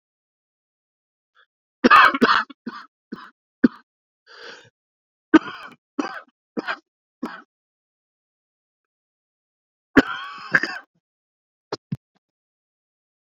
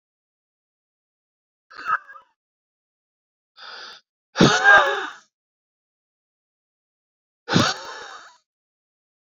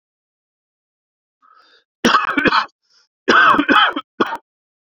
three_cough_length: 13.2 s
three_cough_amplitude: 32768
three_cough_signal_mean_std_ratio: 0.22
exhalation_length: 9.2 s
exhalation_amplitude: 28321
exhalation_signal_mean_std_ratio: 0.26
cough_length: 4.9 s
cough_amplitude: 32767
cough_signal_mean_std_ratio: 0.42
survey_phase: beta (2021-08-13 to 2022-03-07)
age: 45-64
gender: Male
wearing_mask: 'No'
symptom_cough_any: true
symptom_fatigue: true
symptom_headache: true
symptom_onset: 4 days
smoker_status: Ex-smoker
respiratory_condition_asthma: false
respiratory_condition_other: false
recruitment_source: Test and Trace
submission_delay: 2 days
covid_test_result: Positive
covid_test_method: RT-qPCR
covid_ct_value: 28.8
covid_ct_gene: S gene
covid_ct_mean: 29.1
covid_viral_load: 280 copies/ml
covid_viral_load_category: Minimal viral load (< 10K copies/ml)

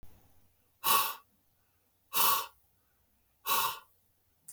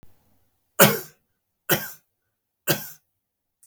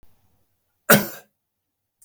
exhalation_length: 4.5 s
exhalation_amplitude: 7979
exhalation_signal_mean_std_ratio: 0.36
three_cough_length: 3.7 s
three_cough_amplitude: 32768
three_cough_signal_mean_std_ratio: 0.25
cough_length: 2.0 s
cough_amplitude: 32766
cough_signal_mean_std_ratio: 0.21
survey_phase: beta (2021-08-13 to 2022-03-07)
age: 45-64
gender: Male
wearing_mask: 'No'
symptom_none: true
smoker_status: Never smoked
respiratory_condition_asthma: false
respiratory_condition_other: false
recruitment_source: REACT
submission_delay: 2 days
covid_test_result: Negative
covid_test_method: RT-qPCR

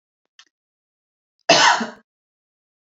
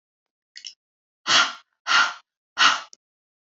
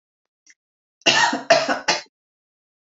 cough_length: 2.8 s
cough_amplitude: 29318
cough_signal_mean_std_ratio: 0.28
exhalation_length: 3.6 s
exhalation_amplitude: 21945
exhalation_signal_mean_std_ratio: 0.34
three_cough_length: 2.8 s
three_cough_amplitude: 28618
three_cough_signal_mean_std_ratio: 0.39
survey_phase: beta (2021-08-13 to 2022-03-07)
age: 18-44
gender: Female
wearing_mask: 'No'
symptom_none: true
smoker_status: Never smoked
respiratory_condition_asthma: false
respiratory_condition_other: false
recruitment_source: REACT
submission_delay: 2 days
covid_test_result: Negative
covid_test_method: RT-qPCR
influenza_a_test_result: Negative
influenza_b_test_result: Negative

